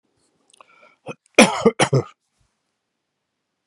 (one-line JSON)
{"cough_length": "3.7 s", "cough_amplitude": 32768, "cough_signal_mean_std_ratio": 0.25, "survey_phase": "beta (2021-08-13 to 2022-03-07)", "age": "65+", "gender": "Male", "wearing_mask": "No", "symptom_none": true, "smoker_status": "Ex-smoker", "respiratory_condition_asthma": false, "respiratory_condition_other": false, "recruitment_source": "REACT", "submission_delay": "4 days", "covid_test_result": "Negative", "covid_test_method": "RT-qPCR"}